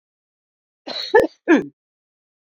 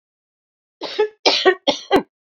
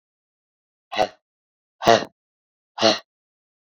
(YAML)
cough_length: 2.5 s
cough_amplitude: 24668
cough_signal_mean_std_ratio: 0.3
three_cough_length: 2.3 s
three_cough_amplitude: 32221
three_cough_signal_mean_std_ratio: 0.41
exhalation_length: 3.8 s
exhalation_amplitude: 27739
exhalation_signal_mean_std_ratio: 0.25
survey_phase: beta (2021-08-13 to 2022-03-07)
age: 45-64
gender: Female
wearing_mask: 'No'
symptom_change_to_sense_of_smell_or_taste: true
symptom_onset: 12 days
smoker_status: Never smoked
respiratory_condition_asthma: false
respiratory_condition_other: false
recruitment_source: REACT
submission_delay: 2 days
covid_test_result: Negative
covid_test_method: RT-qPCR
covid_ct_value: 42.0
covid_ct_gene: N gene